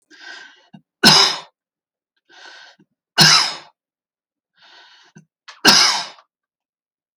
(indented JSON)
{
  "three_cough_length": "7.2 s",
  "three_cough_amplitude": 32768,
  "three_cough_signal_mean_std_ratio": 0.31,
  "survey_phase": "alpha (2021-03-01 to 2021-08-12)",
  "age": "45-64",
  "gender": "Male",
  "wearing_mask": "No",
  "symptom_none": true,
  "smoker_status": "Never smoked",
  "respiratory_condition_asthma": false,
  "respiratory_condition_other": false,
  "recruitment_source": "REACT",
  "submission_delay": "1 day",
  "covid_test_result": "Negative",
  "covid_test_method": "RT-qPCR"
}